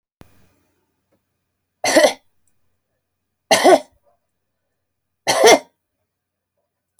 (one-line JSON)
{"three_cough_length": "7.0 s", "three_cough_amplitude": 30769, "three_cough_signal_mean_std_ratio": 0.27, "survey_phase": "alpha (2021-03-01 to 2021-08-12)", "age": "65+", "gender": "Female", "wearing_mask": "No", "symptom_none": true, "smoker_status": "Never smoked", "respiratory_condition_asthma": false, "respiratory_condition_other": false, "recruitment_source": "REACT", "submission_delay": "3 days", "covid_test_result": "Negative", "covid_test_method": "RT-qPCR"}